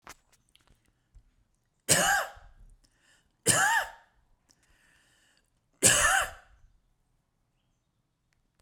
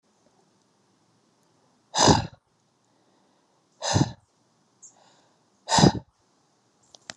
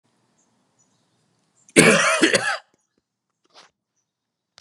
{"three_cough_length": "8.6 s", "three_cough_amplitude": 17988, "three_cough_signal_mean_std_ratio": 0.31, "exhalation_length": "7.2 s", "exhalation_amplitude": 25870, "exhalation_signal_mean_std_ratio": 0.25, "cough_length": "4.6 s", "cough_amplitude": 32768, "cough_signal_mean_std_ratio": 0.3, "survey_phase": "beta (2021-08-13 to 2022-03-07)", "age": "18-44", "gender": "Male", "wearing_mask": "No", "symptom_cough_any": true, "symptom_runny_or_blocked_nose": true, "symptom_sore_throat": true, "symptom_headache": true, "symptom_onset": "2 days", "smoker_status": "Ex-smoker", "respiratory_condition_asthma": false, "respiratory_condition_other": false, "recruitment_source": "Test and Trace", "submission_delay": "2 days", "covid_test_result": "Positive", "covid_test_method": "RT-qPCR", "covid_ct_value": 15.2, "covid_ct_gene": "ORF1ab gene", "covid_ct_mean": 15.5, "covid_viral_load": "8300000 copies/ml", "covid_viral_load_category": "High viral load (>1M copies/ml)"}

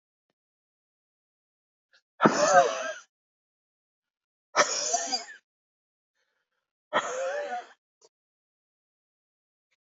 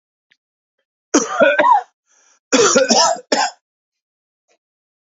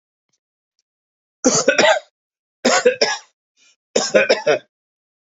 {"exhalation_length": "10.0 s", "exhalation_amplitude": 19206, "exhalation_signal_mean_std_ratio": 0.3, "cough_length": "5.1 s", "cough_amplitude": 32768, "cough_signal_mean_std_ratio": 0.43, "three_cough_length": "5.3 s", "three_cough_amplitude": 28996, "three_cough_signal_mean_std_ratio": 0.4, "survey_phase": "beta (2021-08-13 to 2022-03-07)", "age": "45-64", "gender": "Male", "wearing_mask": "No", "symptom_sore_throat": true, "symptom_fatigue": true, "symptom_headache": true, "symptom_other": true, "smoker_status": "Never smoked", "respiratory_condition_asthma": false, "respiratory_condition_other": false, "recruitment_source": "Test and Trace", "submission_delay": "2 days", "covid_test_result": "Positive", "covid_test_method": "LFT"}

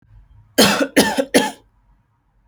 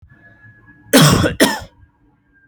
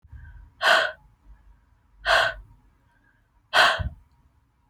{"three_cough_length": "2.5 s", "three_cough_amplitude": 31007, "three_cough_signal_mean_std_ratio": 0.42, "cough_length": "2.5 s", "cough_amplitude": 32768, "cough_signal_mean_std_ratio": 0.4, "exhalation_length": "4.7 s", "exhalation_amplitude": 20834, "exhalation_signal_mean_std_ratio": 0.36, "survey_phase": "alpha (2021-03-01 to 2021-08-12)", "age": "18-44", "gender": "Female", "wearing_mask": "No", "symptom_none": true, "smoker_status": "Never smoked", "respiratory_condition_asthma": false, "respiratory_condition_other": false, "recruitment_source": "REACT", "submission_delay": "3 days", "covid_test_result": "Negative", "covid_test_method": "RT-qPCR"}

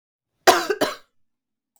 {"cough_length": "1.8 s", "cough_amplitude": 32766, "cough_signal_mean_std_ratio": 0.3, "survey_phase": "beta (2021-08-13 to 2022-03-07)", "age": "18-44", "gender": "Female", "wearing_mask": "No", "symptom_cough_any": true, "symptom_fatigue": true, "symptom_onset": "12 days", "smoker_status": "Never smoked", "respiratory_condition_asthma": false, "respiratory_condition_other": false, "recruitment_source": "REACT", "submission_delay": "3 days", "covid_test_result": "Negative", "covid_test_method": "RT-qPCR", "influenza_a_test_result": "Unknown/Void", "influenza_b_test_result": "Unknown/Void"}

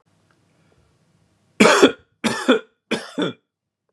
{"three_cough_length": "3.9 s", "three_cough_amplitude": 32768, "three_cough_signal_mean_std_ratio": 0.33, "survey_phase": "beta (2021-08-13 to 2022-03-07)", "age": "18-44", "gender": "Male", "wearing_mask": "No", "symptom_none": true, "symptom_onset": "11 days", "smoker_status": "Current smoker (1 to 10 cigarettes per day)", "respiratory_condition_asthma": false, "respiratory_condition_other": false, "recruitment_source": "REACT", "submission_delay": "8 days", "covid_test_result": "Negative", "covid_test_method": "RT-qPCR"}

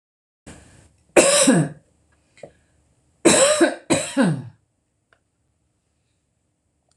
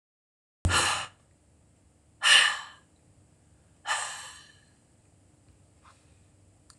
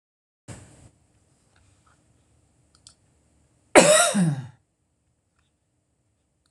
{"three_cough_length": "7.0 s", "three_cough_amplitude": 26028, "three_cough_signal_mean_std_ratio": 0.37, "exhalation_length": "6.8 s", "exhalation_amplitude": 15519, "exhalation_signal_mean_std_ratio": 0.3, "cough_length": "6.5 s", "cough_amplitude": 26028, "cough_signal_mean_std_ratio": 0.24, "survey_phase": "beta (2021-08-13 to 2022-03-07)", "age": "65+", "gender": "Female", "wearing_mask": "No", "symptom_headache": true, "smoker_status": "Never smoked", "respiratory_condition_asthma": false, "respiratory_condition_other": false, "recruitment_source": "REACT", "submission_delay": "2 days", "covid_test_result": "Negative", "covid_test_method": "RT-qPCR", "influenza_a_test_result": "Negative", "influenza_b_test_result": "Negative"}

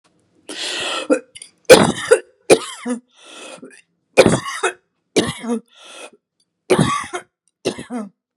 {"three_cough_length": "8.4 s", "three_cough_amplitude": 32768, "three_cough_signal_mean_std_ratio": 0.37, "survey_phase": "beta (2021-08-13 to 2022-03-07)", "age": "65+", "gender": "Female", "wearing_mask": "No", "symptom_none": true, "smoker_status": "Never smoked", "respiratory_condition_asthma": false, "respiratory_condition_other": false, "recruitment_source": "REACT", "submission_delay": "0 days", "covid_test_result": "Negative", "covid_test_method": "RT-qPCR"}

